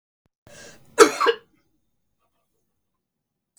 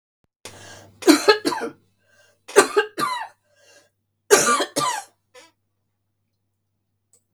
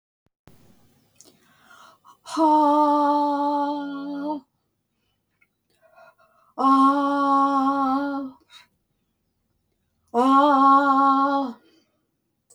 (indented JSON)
{
  "cough_length": "3.6 s",
  "cough_amplitude": 32768,
  "cough_signal_mean_std_ratio": 0.2,
  "three_cough_length": "7.3 s",
  "three_cough_amplitude": 32768,
  "three_cough_signal_mean_std_ratio": 0.33,
  "exhalation_length": "12.5 s",
  "exhalation_amplitude": 15780,
  "exhalation_signal_mean_std_ratio": 0.55,
  "survey_phase": "beta (2021-08-13 to 2022-03-07)",
  "age": "65+",
  "gender": "Female",
  "wearing_mask": "No",
  "symptom_none": true,
  "smoker_status": "Never smoked",
  "respiratory_condition_asthma": false,
  "respiratory_condition_other": false,
  "recruitment_source": "REACT",
  "submission_delay": "5 days",
  "covid_test_result": "Negative",
  "covid_test_method": "RT-qPCR",
  "influenza_a_test_result": "Negative",
  "influenza_b_test_result": "Negative"
}